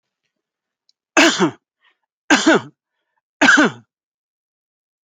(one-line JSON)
{"three_cough_length": "5.0 s", "three_cough_amplitude": 29492, "three_cough_signal_mean_std_ratio": 0.33, "survey_phase": "alpha (2021-03-01 to 2021-08-12)", "age": "45-64", "gender": "Male", "wearing_mask": "No", "symptom_none": true, "smoker_status": "Never smoked", "respiratory_condition_asthma": false, "respiratory_condition_other": false, "recruitment_source": "REACT", "submission_delay": "1 day", "covid_test_result": "Negative", "covid_test_method": "RT-qPCR"}